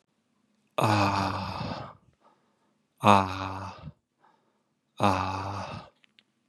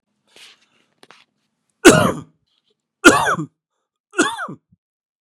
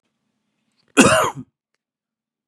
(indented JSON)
{
  "exhalation_length": "6.5 s",
  "exhalation_amplitude": 23492,
  "exhalation_signal_mean_std_ratio": 0.4,
  "three_cough_length": "5.2 s",
  "three_cough_amplitude": 32768,
  "three_cough_signal_mean_std_ratio": 0.28,
  "cough_length": "2.5 s",
  "cough_amplitude": 32767,
  "cough_signal_mean_std_ratio": 0.28,
  "survey_phase": "beta (2021-08-13 to 2022-03-07)",
  "age": "45-64",
  "gender": "Male",
  "wearing_mask": "No",
  "symptom_cough_any": true,
  "symptom_sore_throat": true,
  "smoker_status": "Never smoked",
  "respiratory_condition_asthma": true,
  "respiratory_condition_other": false,
  "recruitment_source": "REACT",
  "submission_delay": "2 days",
  "covid_test_result": "Negative",
  "covid_test_method": "RT-qPCR",
  "influenza_a_test_result": "Negative",
  "influenza_b_test_result": "Negative"
}